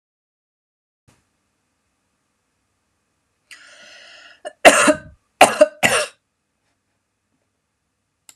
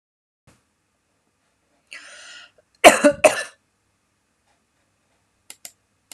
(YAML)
three_cough_length: 8.4 s
three_cough_amplitude: 32768
three_cough_signal_mean_std_ratio: 0.21
cough_length: 6.1 s
cough_amplitude: 32768
cough_signal_mean_std_ratio: 0.18
survey_phase: alpha (2021-03-01 to 2021-08-12)
age: 45-64
gender: Female
wearing_mask: 'No'
symptom_none: true
smoker_status: Never smoked
respiratory_condition_asthma: false
respiratory_condition_other: false
recruitment_source: REACT
submission_delay: 4 days
covid_test_result: Negative
covid_test_method: RT-qPCR